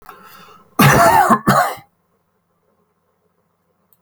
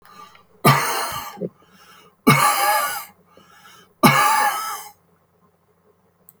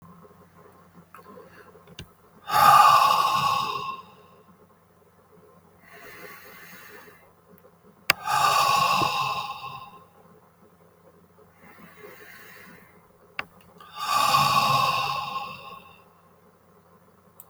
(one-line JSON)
{"cough_length": "4.0 s", "cough_amplitude": 32767, "cough_signal_mean_std_ratio": 0.39, "three_cough_length": "6.4 s", "three_cough_amplitude": 31007, "three_cough_signal_mean_std_ratio": 0.45, "exhalation_length": "17.5 s", "exhalation_amplitude": 32768, "exhalation_signal_mean_std_ratio": 0.42, "survey_phase": "alpha (2021-03-01 to 2021-08-12)", "age": "45-64", "gender": "Male", "wearing_mask": "No", "symptom_none": true, "smoker_status": "Ex-smoker", "respiratory_condition_asthma": false, "respiratory_condition_other": false, "recruitment_source": "REACT", "submission_delay": "1 day", "covid_test_result": "Negative", "covid_test_method": "RT-qPCR"}